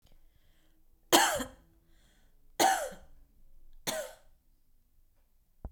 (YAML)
three_cough_length: 5.7 s
three_cough_amplitude: 16244
three_cough_signal_mean_std_ratio: 0.31
survey_phase: beta (2021-08-13 to 2022-03-07)
age: 18-44
gender: Female
wearing_mask: 'No'
symptom_none: true
symptom_onset: 11 days
smoker_status: Never smoked
respiratory_condition_asthma: false
respiratory_condition_other: false
recruitment_source: REACT
submission_delay: 1 day
covid_test_result: Negative
covid_test_method: RT-qPCR